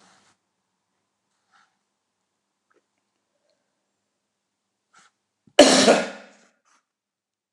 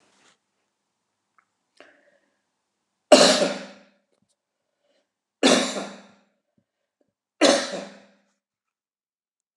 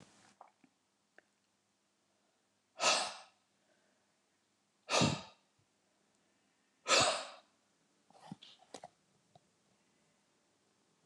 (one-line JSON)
{"cough_length": "7.5 s", "cough_amplitude": 29204, "cough_signal_mean_std_ratio": 0.19, "three_cough_length": "9.6 s", "three_cough_amplitude": 29203, "three_cough_signal_mean_std_ratio": 0.25, "exhalation_length": "11.1 s", "exhalation_amplitude": 5294, "exhalation_signal_mean_std_ratio": 0.25, "survey_phase": "alpha (2021-03-01 to 2021-08-12)", "age": "65+", "gender": "Male", "wearing_mask": "No", "symptom_none": true, "smoker_status": "Ex-smoker", "respiratory_condition_asthma": false, "respiratory_condition_other": false, "recruitment_source": "REACT", "submission_delay": "4 days", "covid_test_result": "Negative", "covid_test_method": "RT-qPCR"}